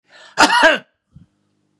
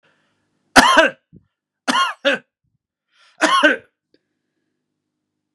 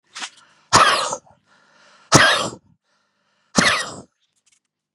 {"cough_length": "1.8 s", "cough_amplitude": 32768, "cough_signal_mean_std_ratio": 0.37, "three_cough_length": "5.5 s", "three_cough_amplitude": 32768, "three_cough_signal_mean_std_ratio": 0.33, "exhalation_length": "4.9 s", "exhalation_amplitude": 32768, "exhalation_signal_mean_std_ratio": 0.36, "survey_phase": "beta (2021-08-13 to 2022-03-07)", "age": "45-64", "gender": "Male", "wearing_mask": "No", "symptom_none": true, "smoker_status": "Never smoked", "respiratory_condition_asthma": true, "respiratory_condition_other": false, "recruitment_source": "REACT", "submission_delay": "1 day", "covid_test_result": "Negative", "covid_test_method": "RT-qPCR", "influenza_a_test_result": "Negative", "influenza_b_test_result": "Negative"}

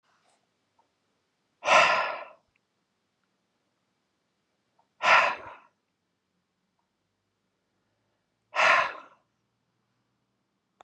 {"exhalation_length": "10.8 s", "exhalation_amplitude": 15456, "exhalation_signal_mean_std_ratio": 0.26, "survey_phase": "beta (2021-08-13 to 2022-03-07)", "age": "45-64", "gender": "Male", "wearing_mask": "No", "symptom_none": true, "smoker_status": "Never smoked", "respiratory_condition_asthma": false, "respiratory_condition_other": false, "recruitment_source": "REACT", "submission_delay": "2 days", "covid_test_result": "Negative", "covid_test_method": "RT-qPCR", "influenza_a_test_result": "Negative", "influenza_b_test_result": "Negative"}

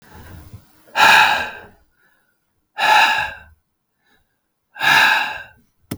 {"exhalation_length": "6.0 s", "exhalation_amplitude": 32768, "exhalation_signal_mean_std_ratio": 0.43, "survey_phase": "beta (2021-08-13 to 2022-03-07)", "age": "45-64", "gender": "Male", "wearing_mask": "No", "symptom_cough_any": true, "symptom_fatigue": true, "symptom_fever_high_temperature": true, "symptom_headache": true, "symptom_onset": "2 days", "smoker_status": "Ex-smoker", "respiratory_condition_asthma": false, "respiratory_condition_other": false, "recruitment_source": "Test and Trace", "submission_delay": "1 day", "covid_test_result": "Positive", "covid_test_method": "RT-qPCR", "covid_ct_value": 26.3, "covid_ct_gene": "ORF1ab gene", "covid_ct_mean": 26.9, "covid_viral_load": "1500 copies/ml", "covid_viral_load_category": "Minimal viral load (< 10K copies/ml)"}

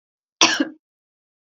{"cough_length": "1.5 s", "cough_amplitude": 32767, "cough_signal_mean_std_ratio": 0.29, "survey_phase": "alpha (2021-03-01 to 2021-08-12)", "age": "45-64", "gender": "Female", "wearing_mask": "No", "symptom_none": true, "smoker_status": "Ex-smoker", "respiratory_condition_asthma": false, "respiratory_condition_other": false, "recruitment_source": "REACT", "submission_delay": "1 day", "covid_test_result": "Negative", "covid_test_method": "RT-qPCR"}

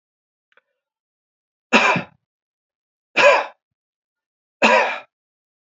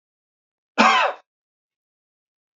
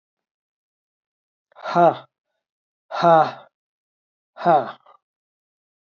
{"three_cough_length": "5.7 s", "three_cough_amplitude": 28410, "three_cough_signal_mean_std_ratio": 0.31, "cough_length": "2.6 s", "cough_amplitude": 28031, "cough_signal_mean_std_ratio": 0.29, "exhalation_length": "5.8 s", "exhalation_amplitude": 25330, "exhalation_signal_mean_std_ratio": 0.29, "survey_phase": "beta (2021-08-13 to 2022-03-07)", "age": "45-64", "gender": "Male", "wearing_mask": "No", "symptom_cough_any": true, "symptom_runny_or_blocked_nose": true, "symptom_headache": true, "symptom_onset": "5 days", "smoker_status": "Never smoked", "respiratory_condition_asthma": false, "respiratory_condition_other": false, "recruitment_source": "Test and Trace", "submission_delay": "2 days", "covid_test_result": "Positive", "covid_test_method": "RT-qPCR", "covid_ct_value": 27.4, "covid_ct_gene": "S gene", "covid_ct_mean": 28.0, "covid_viral_load": "660 copies/ml", "covid_viral_load_category": "Minimal viral load (< 10K copies/ml)"}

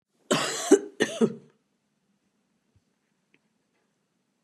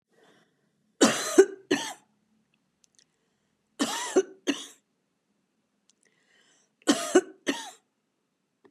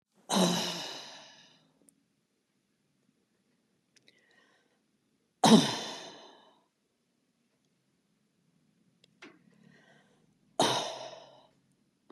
{"cough_length": "4.4 s", "cough_amplitude": 17167, "cough_signal_mean_std_ratio": 0.26, "three_cough_length": "8.7 s", "three_cough_amplitude": 20143, "three_cough_signal_mean_std_ratio": 0.27, "exhalation_length": "12.1 s", "exhalation_amplitude": 15729, "exhalation_signal_mean_std_ratio": 0.24, "survey_phase": "beta (2021-08-13 to 2022-03-07)", "age": "65+", "gender": "Female", "wearing_mask": "No", "symptom_none": true, "smoker_status": "Never smoked", "respiratory_condition_asthma": false, "respiratory_condition_other": false, "recruitment_source": "REACT", "submission_delay": "2 days", "covid_test_result": "Negative", "covid_test_method": "RT-qPCR", "influenza_a_test_result": "Negative", "influenza_b_test_result": "Negative"}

